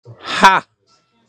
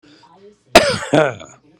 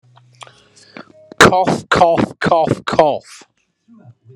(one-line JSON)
{"exhalation_length": "1.3 s", "exhalation_amplitude": 32768, "exhalation_signal_mean_std_ratio": 0.35, "cough_length": "1.8 s", "cough_amplitude": 32768, "cough_signal_mean_std_ratio": 0.37, "three_cough_length": "4.4 s", "three_cough_amplitude": 32768, "three_cough_signal_mean_std_ratio": 0.44, "survey_phase": "beta (2021-08-13 to 2022-03-07)", "age": "45-64", "gender": "Male", "wearing_mask": "No", "symptom_none": true, "smoker_status": "Current smoker (1 to 10 cigarettes per day)", "respiratory_condition_asthma": false, "respiratory_condition_other": false, "recruitment_source": "REACT", "submission_delay": "3 days", "covid_test_result": "Negative", "covid_test_method": "RT-qPCR"}